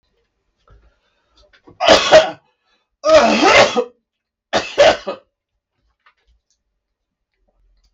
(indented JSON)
{
  "three_cough_length": "7.9 s",
  "three_cough_amplitude": 32768,
  "three_cough_signal_mean_std_ratio": 0.35,
  "survey_phase": "beta (2021-08-13 to 2022-03-07)",
  "age": "45-64",
  "gender": "Male",
  "wearing_mask": "No",
  "symptom_cough_any": true,
  "symptom_runny_or_blocked_nose": true,
  "smoker_status": "Never smoked",
  "respiratory_condition_asthma": false,
  "respiratory_condition_other": false,
  "recruitment_source": "REACT",
  "submission_delay": "3 days",
  "covid_test_result": "Negative",
  "covid_test_method": "RT-qPCR"
}